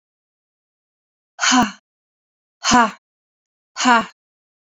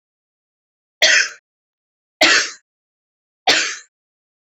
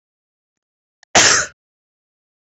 {"exhalation_length": "4.6 s", "exhalation_amplitude": 28764, "exhalation_signal_mean_std_ratio": 0.33, "three_cough_length": "4.4 s", "three_cough_amplitude": 30836, "three_cough_signal_mean_std_ratio": 0.33, "cough_length": "2.6 s", "cough_amplitude": 32645, "cough_signal_mean_std_ratio": 0.27, "survey_phase": "beta (2021-08-13 to 2022-03-07)", "age": "18-44", "gender": "Female", "wearing_mask": "No", "symptom_runny_or_blocked_nose": true, "symptom_shortness_of_breath": true, "symptom_sore_throat": true, "symptom_diarrhoea": true, "symptom_fatigue": true, "symptom_headache": true, "symptom_onset": "2 days", "smoker_status": "Ex-smoker", "respiratory_condition_asthma": false, "respiratory_condition_other": false, "recruitment_source": "Test and Trace", "submission_delay": "2 days", "covid_test_result": "Positive", "covid_test_method": "RT-qPCR"}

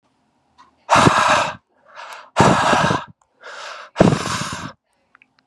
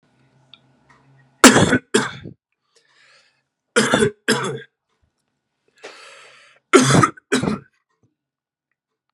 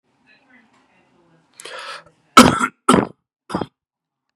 {"exhalation_length": "5.5 s", "exhalation_amplitude": 32768, "exhalation_signal_mean_std_ratio": 0.47, "three_cough_length": "9.1 s", "three_cough_amplitude": 32768, "three_cough_signal_mean_std_ratio": 0.31, "cough_length": "4.4 s", "cough_amplitude": 32768, "cough_signal_mean_std_ratio": 0.25, "survey_phase": "beta (2021-08-13 to 2022-03-07)", "age": "18-44", "gender": "Male", "wearing_mask": "No", "symptom_runny_or_blocked_nose": true, "symptom_fatigue": true, "symptom_change_to_sense_of_smell_or_taste": true, "symptom_loss_of_taste": true, "symptom_onset": "8 days", "smoker_status": "Current smoker (1 to 10 cigarettes per day)", "respiratory_condition_asthma": false, "respiratory_condition_other": false, "recruitment_source": "REACT", "submission_delay": "0 days", "covid_test_result": "Positive", "covid_test_method": "RT-qPCR", "covid_ct_value": 22.4, "covid_ct_gene": "E gene", "influenza_a_test_result": "Negative", "influenza_b_test_result": "Negative"}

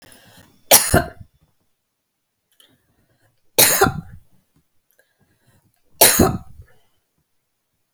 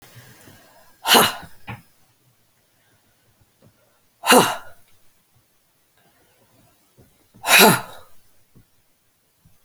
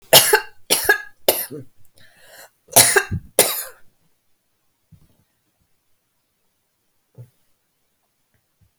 {"three_cough_length": "7.9 s", "three_cough_amplitude": 32768, "three_cough_signal_mean_std_ratio": 0.27, "exhalation_length": "9.6 s", "exhalation_amplitude": 32768, "exhalation_signal_mean_std_ratio": 0.25, "cough_length": "8.8 s", "cough_amplitude": 32768, "cough_signal_mean_std_ratio": 0.27, "survey_phase": "alpha (2021-03-01 to 2021-08-12)", "age": "45-64", "gender": "Female", "wearing_mask": "No", "symptom_none": true, "smoker_status": "Never smoked", "respiratory_condition_asthma": false, "respiratory_condition_other": false, "recruitment_source": "REACT", "submission_delay": "1 day", "covid_test_result": "Negative", "covid_test_method": "RT-qPCR"}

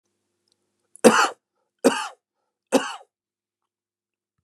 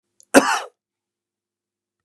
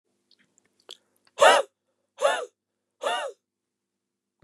{"three_cough_length": "4.4 s", "three_cough_amplitude": 32619, "three_cough_signal_mean_std_ratio": 0.25, "cough_length": "2.0 s", "cough_amplitude": 32768, "cough_signal_mean_std_ratio": 0.23, "exhalation_length": "4.4 s", "exhalation_amplitude": 26219, "exhalation_signal_mean_std_ratio": 0.27, "survey_phase": "beta (2021-08-13 to 2022-03-07)", "age": "45-64", "gender": "Male", "wearing_mask": "No", "symptom_none": true, "smoker_status": "Ex-smoker", "respiratory_condition_asthma": false, "respiratory_condition_other": false, "recruitment_source": "REACT", "submission_delay": "0 days", "covid_test_result": "Negative", "covid_test_method": "RT-qPCR", "influenza_a_test_result": "Negative", "influenza_b_test_result": "Negative"}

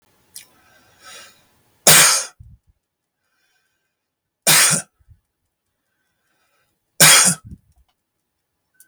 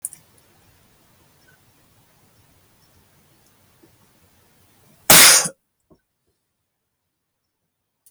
{"three_cough_length": "8.9 s", "three_cough_amplitude": 32768, "three_cough_signal_mean_std_ratio": 0.29, "cough_length": "8.1 s", "cough_amplitude": 32768, "cough_signal_mean_std_ratio": 0.19, "survey_phase": "beta (2021-08-13 to 2022-03-07)", "age": "45-64", "gender": "Male", "wearing_mask": "No", "symptom_sore_throat": true, "smoker_status": "Never smoked", "respiratory_condition_asthma": false, "respiratory_condition_other": false, "recruitment_source": "REACT", "submission_delay": "2 days", "covid_test_result": "Negative", "covid_test_method": "RT-qPCR"}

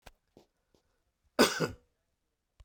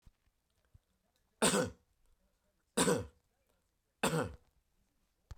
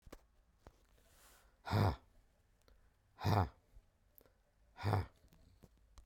{"cough_length": "2.6 s", "cough_amplitude": 12182, "cough_signal_mean_std_ratio": 0.23, "three_cough_length": "5.4 s", "three_cough_amplitude": 5773, "three_cough_signal_mean_std_ratio": 0.31, "exhalation_length": "6.1 s", "exhalation_amplitude": 3319, "exhalation_signal_mean_std_ratio": 0.33, "survey_phase": "beta (2021-08-13 to 2022-03-07)", "age": "45-64", "gender": "Male", "wearing_mask": "No", "symptom_none": true, "smoker_status": "Never smoked", "respiratory_condition_asthma": false, "respiratory_condition_other": false, "recruitment_source": "REACT", "submission_delay": "6 days", "covid_test_result": "Negative", "covid_test_method": "RT-qPCR", "influenza_a_test_result": "Negative", "influenza_b_test_result": "Negative"}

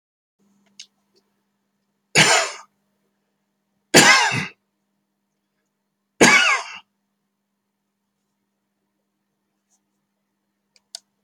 {"three_cough_length": "11.2 s", "three_cough_amplitude": 32768, "three_cough_signal_mean_std_ratio": 0.25, "survey_phase": "beta (2021-08-13 to 2022-03-07)", "age": "65+", "gender": "Male", "wearing_mask": "No", "symptom_loss_of_taste": true, "smoker_status": "Never smoked", "respiratory_condition_asthma": false, "respiratory_condition_other": false, "recruitment_source": "REACT", "submission_delay": "4 days", "covid_test_result": "Negative", "covid_test_method": "RT-qPCR"}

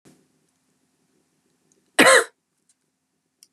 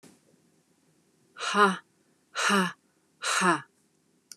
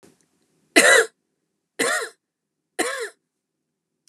{"cough_length": "3.5 s", "cough_amplitude": 29589, "cough_signal_mean_std_ratio": 0.21, "exhalation_length": "4.4 s", "exhalation_amplitude": 11387, "exhalation_signal_mean_std_ratio": 0.39, "three_cough_length": "4.1 s", "three_cough_amplitude": 30805, "three_cough_signal_mean_std_ratio": 0.31, "survey_phase": "beta (2021-08-13 to 2022-03-07)", "age": "45-64", "gender": "Female", "wearing_mask": "No", "symptom_none": true, "smoker_status": "Ex-smoker", "respiratory_condition_asthma": false, "respiratory_condition_other": false, "recruitment_source": "Test and Trace", "submission_delay": "2 days", "covid_test_result": "Negative", "covid_test_method": "ePCR"}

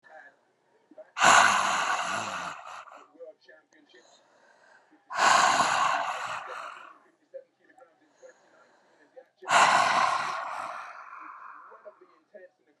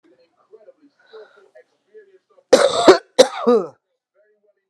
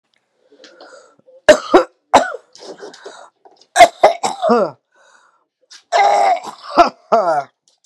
{"exhalation_length": "12.8 s", "exhalation_amplitude": 18104, "exhalation_signal_mean_std_ratio": 0.44, "cough_length": "4.7 s", "cough_amplitude": 32768, "cough_signal_mean_std_ratio": 0.29, "three_cough_length": "7.9 s", "three_cough_amplitude": 32768, "three_cough_signal_mean_std_ratio": 0.39, "survey_phase": "alpha (2021-03-01 to 2021-08-12)", "age": "45-64", "gender": "Female", "wearing_mask": "No", "symptom_diarrhoea": true, "symptom_headache": true, "smoker_status": "Ex-smoker", "respiratory_condition_asthma": false, "respiratory_condition_other": false, "recruitment_source": "REACT", "submission_delay": "25 days", "covid_test_result": "Negative", "covid_test_method": "RT-qPCR"}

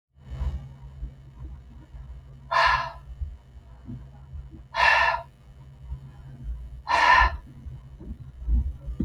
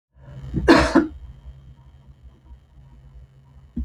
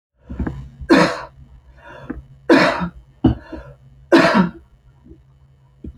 {"exhalation_length": "9.0 s", "exhalation_amplitude": 17031, "exhalation_signal_mean_std_ratio": 0.5, "cough_length": "3.8 s", "cough_amplitude": 28194, "cough_signal_mean_std_ratio": 0.34, "three_cough_length": "6.0 s", "three_cough_amplitude": 28156, "three_cough_signal_mean_std_ratio": 0.4, "survey_phase": "beta (2021-08-13 to 2022-03-07)", "age": "45-64", "gender": "Female", "wearing_mask": "No", "symptom_none": true, "smoker_status": "Never smoked", "respiratory_condition_asthma": false, "respiratory_condition_other": false, "recruitment_source": "REACT", "submission_delay": "1 day", "covid_test_result": "Negative", "covid_test_method": "RT-qPCR"}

